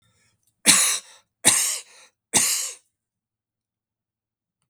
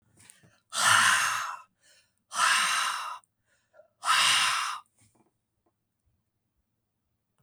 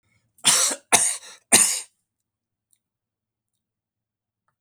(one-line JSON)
{"three_cough_length": "4.7 s", "three_cough_amplitude": 32768, "three_cough_signal_mean_std_ratio": 0.35, "exhalation_length": "7.4 s", "exhalation_amplitude": 11722, "exhalation_signal_mean_std_ratio": 0.45, "cough_length": "4.6 s", "cough_amplitude": 32768, "cough_signal_mean_std_ratio": 0.31, "survey_phase": "beta (2021-08-13 to 2022-03-07)", "age": "65+", "gender": "Male", "wearing_mask": "No", "symptom_none": true, "smoker_status": "Never smoked", "respiratory_condition_asthma": false, "respiratory_condition_other": false, "recruitment_source": "REACT", "submission_delay": "1 day", "covid_test_result": "Negative", "covid_test_method": "RT-qPCR", "influenza_a_test_result": "Unknown/Void", "influenza_b_test_result": "Unknown/Void"}